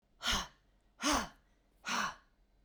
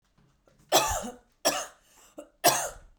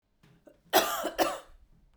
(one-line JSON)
{"exhalation_length": "2.6 s", "exhalation_amplitude": 3526, "exhalation_signal_mean_std_ratio": 0.45, "three_cough_length": "3.0 s", "three_cough_amplitude": 14846, "three_cough_signal_mean_std_ratio": 0.39, "cough_length": "2.0 s", "cough_amplitude": 11571, "cough_signal_mean_std_ratio": 0.4, "survey_phase": "beta (2021-08-13 to 2022-03-07)", "age": "45-64", "gender": "Female", "wearing_mask": "No", "symptom_none": true, "smoker_status": "Never smoked", "respiratory_condition_asthma": false, "respiratory_condition_other": false, "recruitment_source": "REACT", "submission_delay": "1 day", "covid_test_result": "Negative", "covid_test_method": "RT-qPCR"}